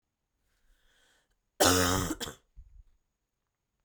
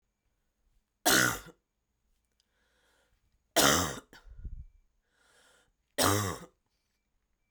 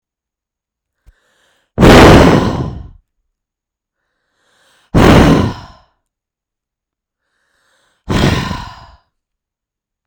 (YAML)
cough_length: 3.8 s
cough_amplitude: 13203
cough_signal_mean_std_ratio: 0.31
three_cough_length: 7.5 s
three_cough_amplitude: 14007
three_cough_signal_mean_std_ratio: 0.3
exhalation_length: 10.1 s
exhalation_amplitude: 32768
exhalation_signal_mean_std_ratio: 0.35
survey_phase: beta (2021-08-13 to 2022-03-07)
age: 18-44
gender: Female
wearing_mask: 'No'
symptom_none: true
symptom_onset: 8 days
smoker_status: Never smoked
respiratory_condition_asthma: true
respiratory_condition_other: false
recruitment_source: REACT
submission_delay: 2 days
covid_test_result: Negative
covid_test_method: RT-qPCR